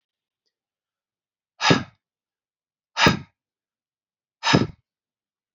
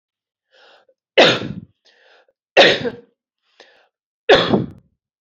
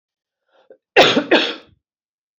{"exhalation_length": "5.5 s", "exhalation_amplitude": 32767, "exhalation_signal_mean_std_ratio": 0.24, "three_cough_length": "5.2 s", "three_cough_amplitude": 29579, "three_cough_signal_mean_std_ratio": 0.32, "cough_length": "2.4 s", "cough_amplitude": 30004, "cough_signal_mean_std_ratio": 0.34, "survey_phase": "beta (2021-08-13 to 2022-03-07)", "age": "45-64", "gender": "Female", "wearing_mask": "No", "symptom_cough_any": true, "symptom_runny_or_blocked_nose": true, "symptom_shortness_of_breath": true, "symptom_sore_throat": true, "symptom_fatigue": true, "symptom_onset": "3 days", "smoker_status": "Never smoked", "respiratory_condition_asthma": false, "respiratory_condition_other": false, "recruitment_source": "Test and Trace", "submission_delay": "2 days", "covid_test_result": "Positive", "covid_test_method": "RT-qPCR", "covid_ct_value": 23.8, "covid_ct_gene": "ORF1ab gene", "covid_ct_mean": 24.6, "covid_viral_load": "8600 copies/ml", "covid_viral_load_category": "Minimal viral load (< 10K copies/ml)"}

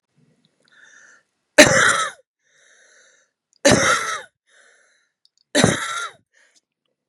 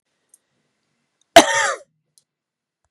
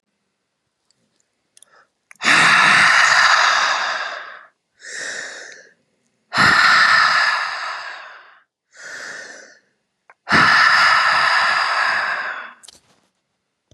{"three_cough_length": "7.1 s", "three_cough_amplitude": 32768, "three_cough_signal_mean_std_ratio": 0.32, "cough_length": "2.9 s", "cough_amplitude": 32768, "cough_signal_mean_std_ratio": 0.21, "exhalation_length": "13.7 s", "exhalation_amplitude": 30128, "exhalation_signal_mean_std_ratio": 0.56, "survey_phase": "beta (2021-08-13 to 2022-03-07)", "age": "45-64", "gender": "Female", "wearing_mask": "No", "symptom_fatigue": true, "symptom_headache": true, "smoker_status": "Never smoked", "respiratory_condition_asthma": false, "respiratory_condition_other": false, "recruitment_source": "Test and Trace", "submission_delay": "2 days", "covid_test_result": "Positive", "covid_test_method": "ePCR"}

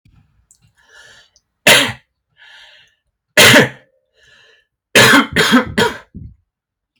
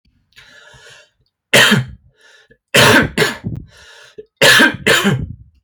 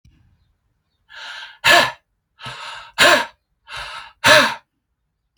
{"cough_length": "7.0 s", "cough_amplitude": 32768, "cough_signal_mean_std_ratio": 0.37, "three_cough_length": "5.6 s", "three_cough_amplitude": 32768, "three_cough_signal_mean_std_ratio": 0.46, "exhalation_length": "5.4 s", "exhalation_amplitude": 32767, "exhalation_signal_mean_std_ratio": 0.35, "survey_phase": "alpha (2021-03-01 to 2021-08-12)", "age": "18-44", "gender": "Male", "wearing_mask": "No", "symptom_none": true, "smoker_status": "Ex-smoker", "respiratory_condition_asthma": false, "respiratory_condition_other": false, "recruitment_source": "REACT", "submission_delay": "3 days", "covid_test_result": "Negative", "covid_test_method": "RT-qPCR"}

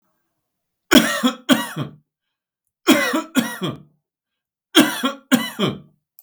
{"three_cough_length": "6.2 s", "three_cough_amplitude": 32768, "three_cough_signal_mean_std_ratio": 0.4, "survey_phase": "beta (2021-08-13 to 2022-03-07)", "age": "65+", "gender": "Male", "wearing_mask": "No", "symptom_none": true, "smoker_status": "Ex-smoker", "respiratory_condition_asthma": false, "respiratory_condition_other": false, "recruitment_source": "REACT", "submission_delay": "2 days", "covid_test_result": "Negative", "covid_test_method": "RT-qPCR", "influenza_a_test_result": "Negative", "influenza_b_test_result": "Negative"}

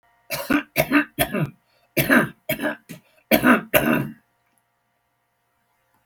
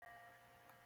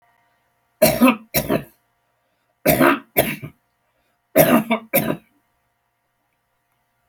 {"cough_length": "6.1 s", "cough_amplitude": 32046, "cough_signal_mean_std_ratio": 0.42, "exhalation_length": "0.9 s", "exhalation_amplitude": 125, "exhalation_signal_mean_std_ratio": 1.1, "three_cough_length": "7.1 s", "three_cough_amplitude": 32768, "three_cough_signal_mean_std_ratio": 0.36, "survey_phase": "alpha (2021-03-01 to 2021-08-12)", "age": "65+", "gender": "Male", "wearing_mask": "No", "symptom_none": true, "smoker_status": "Ex-smoker", "respiratory_condition_asthma": false, "respiratory_condition_other": false, "recruitment_source": "REACT", "submission_delay": "4 days", "covid_test_result": "Negative", "covid_test_method": "RT-qPCR"}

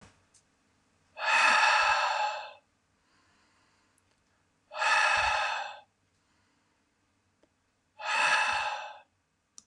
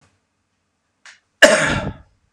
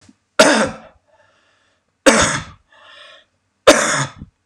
{"exhalation_length": "9.7 s", "exhalation_amplitude": 8444, "exhalation_signal_mean_std_ratio": 0.47, "cough_length": "2.3 s", "cough_amplitude": 32768, "cough_signal_mean_std_ratio": 0.31, "three_cough_length": "4.5 s", "three_cough_amplitude": 32768, "three_cough_signal_mean_std_ratio": 0.37, "survey_phase": "beta (2021-08-13 to 2022-03-07)", "age": "45-64", "gender": "Male", "wearing_mask": "No", "symptom_none": true, "symptom_onset": "12 days", "smoker_status": "Never smoked", "respiratory_condition_asthma": false, "respiratory_condition_other": false, "recruitment_source": "REACT", "submission_delay": "3 days", "covid_test_result": "Negative", "covid_test_method": "RT-qPCR", "influenza_a_test_result": "Unknown/Void", "influenza_b_test_result": "Unknown/Void"}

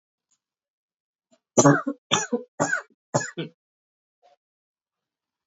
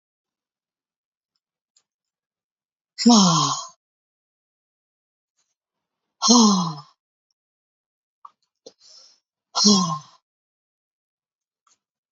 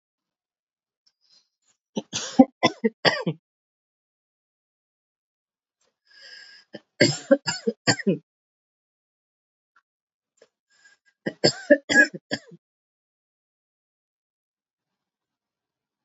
{"cough_length": "5.5 s", "cough_amplitude": 26758, "cough_signal_mean_std_ratio": 0.27, "exhalation_length": "12.1 s", "exhalation_amplitude": 26631, "exhalation_signal_mean_std_ratio": 0.27, "three_cough_length": "16.0 s", "three_cough_amplitude": 27892, "three_cough_signal_mean_std_ratio": 0.21, "survey_phase": "beta (2021-08-13 to 2022-03-07)", "age": "18-44", "gender": "Female", "wearing_mask": "No", "symptom_cough_any": true, "symptom_runny_or_blocked_nose": true, "symptom_sore_throat": true, "symptom_onset": "4 days", "smoker_status": "Current smoker (1 to 10 cigarettes per day)", "respiratory_condition_asthma": false, "respiratory_condition_other": false, "recruitment_source": "Test and Trace", "submission_delay": "2 days", "covid_test_result": "Positive", "covid_test_method": "RT-qPCR", "covid_ct_value": 17.7, "covid_ct_gene": "ORF1ab gene", "covid_ct_mean": 17.8, "covid_viral_load": "1500000 copies/ml", "covid_viral_load_category": "High viral load (>1M copies/ml)"}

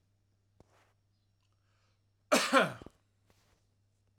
{"cough_length": "4.2 s", "cough_amplitude": 10693, "cough_signal_mean_std_ratio": 0.23, "survey_phase": "alpha (2021-03-01 to 2021-08-12)", "age": "45-64", "gender": "Male", "wearing_mask": "No", "symptom_change_to_sense_of_smell_or_taste": true, "smoker_status": "Never smoked", "respiratory_condition_asthma": false, "respiratory_condition_other": false, "recruitment_source": "REACT", "submission_delay": "2 days", "covid_test_result": "Negative", "covid_test_method": "RT-qPCR"}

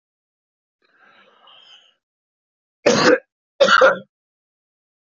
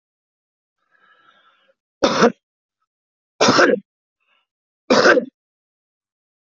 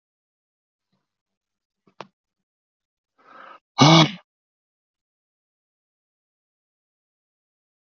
{"cough_length": "5.1 s", "cough_amplitude": 27836, "cough_signal_mean_std_ratio": 0.29, "three_cough_length": "6.6 s", "three_cough_amplitude": 32768, "three_cough_signal_mean_std_ratio": 0.3, "exhalation_length": "7.9 s", "exhalation_amplitude": 26544, "exhalation_signal_mean_std_ratio": 0.16, "survey_phase": "beta (2021-08-13 to 2022-03-07)", "age": "45-64", "gender": "Male", "wearing_mask": "No", "symptom_cough_any": true, "symptom_runny_or_blocked_nose": true, "symptom_fatigue": true, "symptom_fever_high_temperature": true, "symptom_headache": true, "symptom_loss_of_taste": true, "smoker_status": "Current smoker (1 to 10 cigarettes per day)", "respiratory_condition_asthma": false, "respiratory_condition_other": false, "recruitment_source": "Test and Trace", "submission_delay": "2 days", "covid_test_result": "Positive", "covid_test_method": "RT-qPCR", "covid_ct_value": 15.2, "covid_ct_gene": "ORF1ab gene", "covid_ct_mean": 15.6, "covid_viral_load": "7800000 copies/ml", "covid_viral_load_category": "High viral load (>1M copies/ml)"}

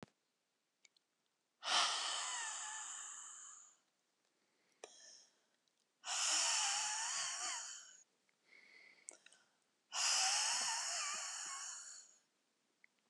{"exhalation_length": "13.1 s", "exhalation_amplitude": 3359, "exhalation_signal_mean_std_ratio": 0.53, "survey_phase": "beta (2021-08-13 to 2022-03-07)", "age": "65+", "gender": "Female", "wearing_mask": "No", "symptom_shortness_of_breath": true, "symptom_fatigue": true, "symptom_headache": true, "symptom_change_to_sense_of_smell_or_taste": true, "symptom_other": true, "smoker_status": "Ex-smoker", "respiratory_condition_asthma": true, "respiratory_condition_other": true, "recruitment_source": "Test and Trace", "submission_delay": "2 days", "covid_test_result": "Positive", "covid_test_method": "LAMP"}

